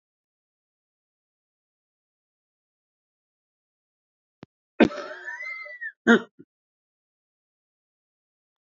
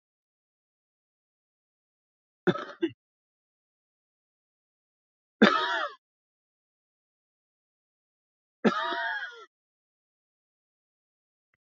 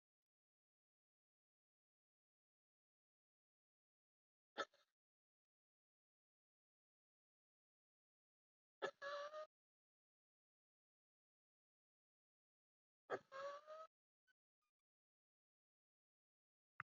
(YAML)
cough_length: 8.7 s
cough_amplitude: 20531
cough_signal_mean_std_ratio: 0.16
three_cough_length: 11.7 s
three_cough_amplitude: 23004
three_cough_signal_mean_std_ratio: 0.22
exhalation_length: 17.0 s
exhalation_amplitude: 823
exhalation_signal_mean_std_ratio: 0.19
survey_phase: beta (2021-08-13 to 2022-03-07)
age: 65+
gender: Male
wearing_mask: 'No'
symptom_cough_any: true
symptom_runny_or_blocked_nose: true
symptom_sore_throat: true
symptom_fatigue: true
symptom_fever_high_temperature: true
symptom_headache: true
symptom_change_to_sense_of_smell_or_taste: true
smoker_status: Ex-smoker
respiratory_condition_asthma: false
respiratory_condition_other: false
recruitment_source: Test and Trace
submission_delay: 1 day
covid_test_result: Positive
covid_test_method: RT-qPCR
covid_ct_value: 13.4
covid_ct_gene: ORF1ab gene
covid_ct_mean: 14.6
covid_viral_load: 16000000 copies/ml
covid_viral_load_category: High viral load (>1M copies/ml)